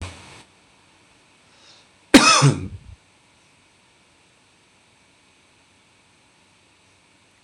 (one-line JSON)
{"cough_length": "7.4 s", "cough_amplitude": 26028, "cough_signal_mean_std_ratio": 0.21, "survey_phase": "beta (2021-08-13 to 2022-03-07)", "age": "45-64", "gender": "Male", "wearing_mask": "No", "symptom_none": true, "smoker_status": "Never smoked", "respiratory_condition_asthma": false, "respiratory_condition_other": false, "recruitment_source": "REACT", "submission_delay": "1 day", "covid_test_result": "Negative", "covid_test_method": "RT-qPCR", "influenza_a_test_result": "Negative", "influenza_b_test_result": "Negative"}